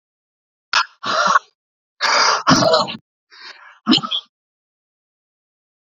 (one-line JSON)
{"exhalation_length": "5.9 s", "exhalation_amplitude": 32742, "exhalation_signal_mean_std_ratio": 0.42, "survey_phase": "beta (2021-08-13 to 2022-03-07)", "age": "45-64", "gender": "Male", "wearing_mask": "No", "symptom_none": true, "smoker_status": "Never smoked", "respiratory_condition_asthma": false, "respiratory_condition_other": false, "recruitment_source": "REACT", "submission_delay": "0 days", "covid_test_result": "Negative", "covid_test_method": "RT-qPCR", "influenza_a_test_result": "Negative", "influenza_b_test_result": "Negative"}